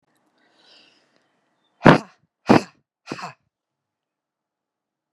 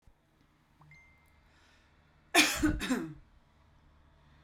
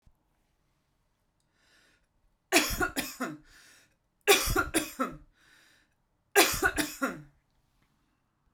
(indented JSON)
{
  "exhalation_length": "5.1 s",
  "exhalation_amplitude": 32768,
  "exhalation_signal_mean_std_ratio": 0.17,
  "cough_length": "4.4 s",
  "cough_amplitude": 10100,
  "cough_signal_mean_std_ratio": 0.31,
  "three_cough_length": "8.5 s",
  "three_cough_amplitude": 19772,
  "three_cough_signal_mean_std_ratio": 0.34,
  "survey_phase": "beta (2021-08-13 to 2022-03-07)",
  "age": "18-44",
  "gender": "Female",
  "wearing_mask": "No",
  "symptom_cough_any": true,
  "symptom_headache": true,
  "symptom_onset": "8 days",
  "smoker_status": "Never smoked",
  "respiratory_condition_asthma": false,
  "respiratory_condition_other": false,
  "recruitment_source": "REACT",
  "submission_delay": "1 day",
  "covid_test_result": "Negative",
  "covid_test_method": "RT-qPCR"
}